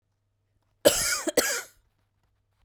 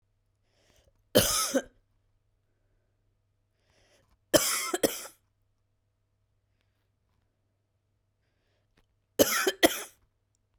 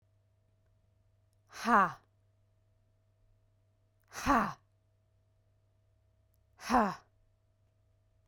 {"cough_length": "2.6 s", "cough_amplitude": 20568, "cough_signal_mean_std_ratio": 0.35, "three_cough_length": "10.6 s", "three_cough_amplitude": 16391, "three_cough_signal_mean_std_ratio": 0.26, "exhalation_length": "8.3 s", "exhalation_amplitude": 7409, "exhalation_signal_mean_std_ratio": 0.25, "survey_phase": "beta (2021-08-13 to 2022-03-07)", "age": "18-44", "gender": "Female", "wearing_mask": "No", "symptom_cough_any": true, "symptom_runny_or_blocked_nose": true, "symptom_diarrhoea": true, "symptom_fatigue": true, "symptom_headache": true, "smoker_status": "Never smoked", "respiratory_condition_asthma": false, "respiratory_condition_other": false, "recruitment_source": "Test and Trace", "submission_delay": "2 days", "covid_test_result": "Positive", "covid_test_method": "RT-qPCR", "covid_ct_value": 21.6, "covid_ct_gene": "ORF1ab gene"}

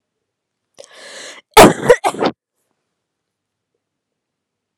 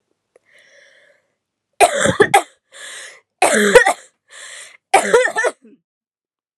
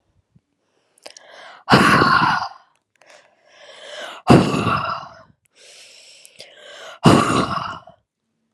{"cough_length": "4.8 s", "cough_amplitude": 32768, "cough_signal_mean_std_ratio": 0.24, "three_cough_length": "6.6 s", "three_cough_amplitude": 32768, "three_cough_signal_mean_std_ratio": 0.38, "exhalation_length": "8.5 s", "exhalation_amplitude": 32768, "exhalation_signal_mean_std_ratio": 0.4, "survey_phase": "alpha (2021-03-01 to 2021-08-12)", "age": "18-44", "gender": "Female", "wearing_mask": "No", "symptom_cough_any": true, "symptom_fatigue": true, "symptom_headache": true, "symptom_onset": "3 days", "smoker_status": "Never smoked", "respiratory_condition_asthma": false, "respiratory_condition_other": false, "recruitment_source": "Test and Trace", "submission_delay": "2 days", "covid_test_result": "Positive", "covid_test_method": "RT-qPCR", "covid_ct_value": 15.2, "covid_ct_gene": "ORF1ab gene", "covid_ct_mean": 15.5, "covid_viral_load": "8400000 copies/ml", "covid_viral_load_category": "High viral load (>1M copies/ml)"}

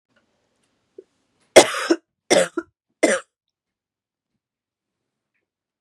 {"three_cough_length": "5.8 s", "three_cough_amplitude": 32768, "three_cough_signal_mean_std_ratio": 0.22, "survey_phase": "beta (2021-08-13 to 2022-03-07)", "age": "45-64", "gender": "Female", "wearing_mask": "No", "symptom_cough_any": true, "symptom_runny_or_blocked_nose": true, "symptom_sore_throat": true, "symptom_fatigue": true, "symptom_fever_high_temperature": true, "symptom_headache": true, "symptom_change_to_sense_of_smell_or_taste": true, "symptom_other": true, "symptom_onset": "4 days", "smoker_status": "Never smoked", "respiratory_condition_asthma": false, "respiratory_condition_other": false, "recruitment_source": "Test and Trace", "submission_delay": "2 days", "covid_test_result": "Positive", "covid_test_method": "RT-qPCR", "covid_ct_value": 25.3, "covid_ct_gene": "N gene"}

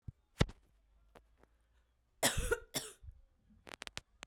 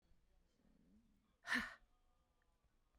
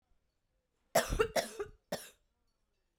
{"cough_length": "4.3 s", "cough_amplitude": 5766, "cough_signal_mean_std_ratio": 0.27, "exhalation_length": "3.0 s", "exhalation_amplitude": 1609, "exhalation_signal_mean_std_ratio": 0.25, "three_cough_length": "3.0 s", "three_cough_amplitude": 5940, "three_cough_signal_mean_std_ratio": 0.31, "survey_phase": "beta (2021-08-13 to 2022-03-07)", "age": "18-44", "gender": "Female", "wearing_mask": "No", "symptom_cough_any": true, "symptom_runny_or_blocked_nose": true, "symptom_shortness_of_breath": true, "symptom_sore_throat": true, "symptom_fatigue": true, "symptom_headache": true, "symptom_change_to_sense_of_smell_or_taste": true, "symptom_loss_of_taste": true, "symptom_onset": "3 days", "smoker_status": "Ex-smoker", "respiratory_condition_asthma": false, "respiratory_condition_other": false, "recruitment_source": "Test and Trace", "submission_delay": "1 day", "covid_test_result": "Positive", "covid_test_method": "RT-qPCR", "covid_ct_value": 18.5, "covid_ct_gene": "ORF1ab gene", "covid_ct_mean": 18.7, "covid_viral_load": "720000 copies/ml", "covid_viral_load_category": "Low viral load (10K-1M copies/ml)"}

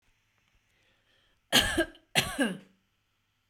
{"cough_length": "3.5 s", "cough_amplitude": 11949, "cough_signal_mean_std_ratio": 0.32, "survey_phase": "beta (2021-08-13 to 2022-03-07)", "age": "45-64", "gender": "Female", "wearing_mask": "No", "symptom_none": true, "smoker_status": "Never smoked", "respiratory_condition_asthma": true, "respiratory_condition_other": false, "recruitment_source": "REACT", "submission_delay": "4 days", "covid_test_result": "Negative", "covid_test_method": "RT-qPCR"}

